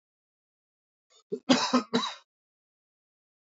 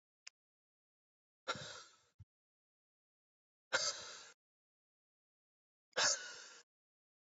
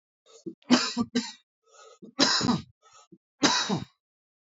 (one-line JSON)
{"cough_length": "3.5 s", "cough_amplitude": 14295, "cough_signal_mean_std_ratio": 0.28, "exhalation_length": "7.3 s", "exhalation_amplitude": 3254, "exhalation_signal_mean_std_ratio": 0.26, "three_cough_length": "4.5 s", "three_cough_amplitude": 16769, "three_cough_signal_mean_std_ratio": 0.42, "survey_phase": "alpha (2021-03-01 to 2021-08-12)", "age": "18-44", "gender": "Male", "wearing_mask": "No", "symptom_cough_any": true, "smoker_status": "Ex-smoker", "respiratory_condition_asthma": false, "respiratory_condition_other": false, "recruitment_source": "Test and Trace", "submission_delay": "2 days", "covid_test_result": "Positive", "covid_test_method": "RT-qPCR", "covid_ct_value": 19.7, "covid_ct_gene": "ORF1ab gene"}